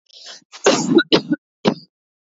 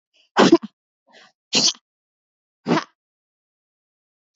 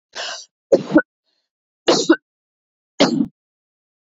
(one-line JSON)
{"cough_length": "2.4 s", "cough_amplitude": 29686, "cough_signal_mean_std_ratio": 0.4, "exhalation_length": "4.4 s", "exhalation_amplitude": 26837, "exhalation_signal_mean_std_ratio": 0.26, "three_cough_length": "4.0 s", "three_cough_amplitude": 28130, "three_cough_signal_mean_std_ratio": 0.33, "survey_phase": "beta (2021-08-13 to 2022-03-07)", "age": "18-44", "gender": "Female", "wearing_mask": "No", "symptom_cough_any": true, "symptom_sore_throat": true, "symptom_fatigue": true, "symptom_headache": true, "smoker_status": "Never smoked", "respiratory_condition_asthma": false, "respiratory_condition_other": false, "recruitment_source": "Test and Trace", "submission_delay": "2 days", "covid_test_result": "Positive", "covid_test_method": "RT-qPCR", "covid_ct_value": 20.3, "covid_ct_gene": "ORF1ab gene", "covid_ct_mean": 20.4, "covid_viral_load": "200000 copies/ml", "covid_viral_load_category": "Low viral load (10K-1M copies/ml)"}